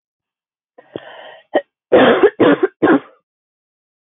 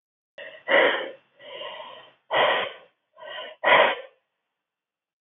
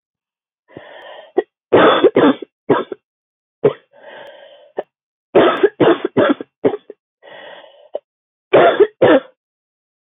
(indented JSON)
{
  "cough_length": "4.1 s",
  "cough_amplitude": 30133,
  "cough_signal_mean_std_ratio": 0.38,
  "exhalation_length": "5.2 s",
  "exhalation_amplitude": 21414,
  "exhalation_signal_mean_std_ratio": 0.41,
  "three_cough_length": "10.0 s",
  "three_cough_amplitude": 28530,
  "three_cough_signal_mean_std_ratio": 0.39,
  "survey_phase": "beta (2021-08-13 to 2022-03-07)",
  "age": "18-44",
  "gender": "Female",
  "wearing_mask": "No",
  "symptom_cough_any": true,
  "symptom_new_continuous_cough": true,
  "symptom_runny_or_blocked_nose": true,
  "symptom_shortness_of_breath": true,
  "symptom_abdominal_pain": true,
  "symptom_diarrhoea": true,
  "symptom_fever_high_temperature": true,
  "symptom_change_to_sense_of_smell_or_taste": true,
  "symptom_onset": "4 days",
  "smoker_status": "Never smoked",
  "respiratory_condition_asthma": true,
  "respiratory_condition_other": false,
  "recruitment_source": "Test and Trace",
  "submission_delay": "1 day",
  "covid_test_result": "Positive",
  "covid_test_method": "RT-qPCR",
  "covid_ct_value": 30.6,
  "covid_ct_gene": "ORF1ab gene"
}